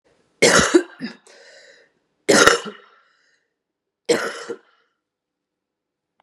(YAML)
three_cough_length: 6.2 s
three_cough_amplitude: 32768
three_cough_signal_mean_std_ratio: 0.31
survey_phase: beta (2021-08-13 to 2022-03-07)
age: 45-64
gender: Female
wearing_mask: 'No'
symptom_cough_any: true
symptom_new_continuous_cough: true
symptom_shortness_of_breath: true
symptom_diarrhoea: true
symptom_fatigue: true
symptom_change_to_sense_of_smell_or_taste: true
symptom_loss_of_taste: true
symptom_other: true
symptom_onset: 5 days
smoker_status: Ex-smoker
respiratory_condition_asthma: true
respiratory_condition_other: false
recruitment_source: Test and Trace
submission_delay: 1 day
covid_test_result: Positive
covid_test_method: RT-qPCR
covid_ct_value: 23.3
covid_ct_gene: N gene
covid_ct_mean: 23.7
covid_viral_load: 17000 copies/ml
covid_viral_load_category: Low viral load (10K-1M copies/ml)